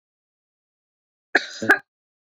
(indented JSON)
{
  "cough_length": "2.4 s",
  "cough_amplitude": 26770,
  "cough_signal_mean_std_ratio": 0.21,
  "survey_phase": "beta (2021-08-13 to 2022-03-07)",
  "age": "18-44",
  "gender": "Female",
  "wearing_mask": "No",
  "symptom_none": true,
  "smoker_status": "Ex-smoker",
  "respiratory_condition_asthma": false,
  "respiratory_condition_other": false,
  "recruitment_source": "REACT",
  "submission_delay": "2 days",
  "covid_test_result": "Negative",
  "covid_test_method": "RT-qPCR"
}